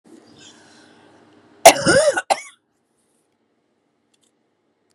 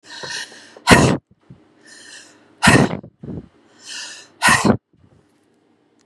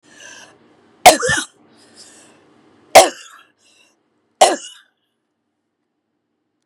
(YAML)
cough_length: 4.9 s
cough_amplitude: 32768
cough_signal_mean_std_ratio: 0.24
exhalation_length: 6.1 s
exhalation_amplitude: 32768
exhalation_signal_mean_std_ratio: 0.35
three_cough_length: 6.7 s
three_cough_amplitude: 32768
three_cough_signal_mean_std_ratio: 0.22
survey_phase: beta (2021-08-13 to 2022-03-07)
age: 45-64
gender: Female
wearing_mask: 'No'
symptom_fatigue: true
symptom_onset: 13 days
smoker_status: Ex-smoker
respiratory_condition_asthma: false
respiratory_condition_other: false
recruitment_source: REACT
submission_delay: 8 days
covid_test_result: Negative
covid_test_method: RT-qPCR
influenza_a_test_result: Negative
influenza_b_test_result: Negative